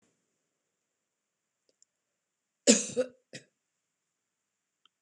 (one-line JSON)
{"cough_length": "5.0 s", "cough_amplitude": 17153, "cough_signal_mean_std_ratio": 0.16, "survey_phase": "beta (2021-08-13 to 2022-03-07)", "age": "65+", "gender": "Female", "wearing_mask": "No", "symptom_none": true, "smoker_status": "Never smoked", "respiratory_condition_asthma": false, "respiratory_condition_other": false, "recruitment_source": "REACT", "submission_delay": "1 day", "covid_test_result": "Negative", "covid_test_method": "RT-qPCR", "influenza_a_test_result": "Negative", "influenza_b_test_result": "Negative"}